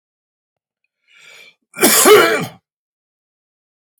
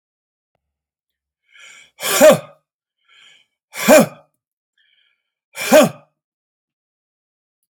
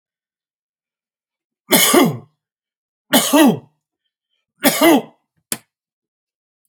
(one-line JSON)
{"cough_length": "4.0 s", "cough_amplitude": 32768, "cough_signal_mean_std_ratio": 0.33, "exhalation_length": "7.7 s", "exhalation_amplitude": 31697, "exhalation_signal_mean_std_ratio": 0.26, "three_cough_length": "6.7 s", "three_cough_amplitude": 32768, "three_cough_signal_mean_std_ratio": 0.34, "survey_phase": "alpha (2021-03-01 to 2021-08-12)", "age": "45-64", "gender": "Male", "wearing_mask": "No", "symptom_none": true, "symptom_onset": "11 days", "smoker_status": "Ex-smoker", "respiratory_condition_asthma": false, "respiratory_condition_other": false, "recruitment_source": "REACT", "submission_delay": "5 days", "covid_test_result": "Negative", "covid_test_method": "RT-qPCR"}